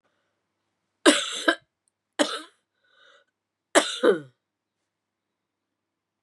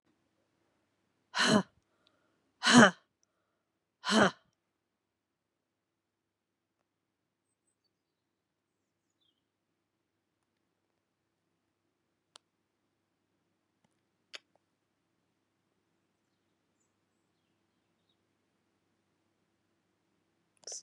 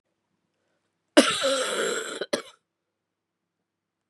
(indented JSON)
{
  "three_cough_length": "6.2 s",
  "three_cough_amplitude": 25578,
  "three_cough_signal_mean_std_ratio": 0.25,
  "exhalation_length": "20.8 s",
  "exhalation_amplitude": 14472,
  "exhalation_signal_mean_std_ratio": 0.14,
  "cough_length": "4.1 s",
  "cough_amplitude": 30918,
  "cough_signal_mean_std_ratio": 0.34,
  "survey_phase": "beta (2021-08-13 to 2022-03-07)",
  "age": "65+",
  "gender": "Female",
  "wearing_mask": "No",
  "symptom_cough_any": true,
  "symptom_runny_or_blocked_nose": true,
  "symptom_fatigue": true,
  "smoker_status": "Ex-smoker",
  "respiratory_condition_asthma": false,
  "respiratory_condition_other": false,
  "recruitment_source": "Test and Trace",
  "submission_delay": "2 days",
  "covid_test_result": "Positive",
  "covid_test_method": "LFT"
}